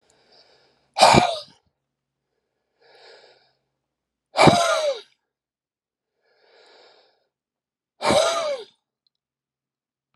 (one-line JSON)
{"exhalation_length": "10.2 s", "exhalation_amplitude": 32751, "exhalation_signal_mean_std_ratio": 0.29, "survey_phase": "alpha (2021-03-01 to 2021-08-12)", "age": "45-64", "gender": "Male", "wearing_mask": "No", "symptom_cough_any": true, "symptom_onset": "2 days", "smoker_status": "Never smoked", "respiratory_condition_asthma": true, "respiratory_condition_other": false, "recruitment_source": "Test and Trace", "submission_delay": "2 days", "covid_test_result": "Positive", "covid_test_method": "RT-qPCR"}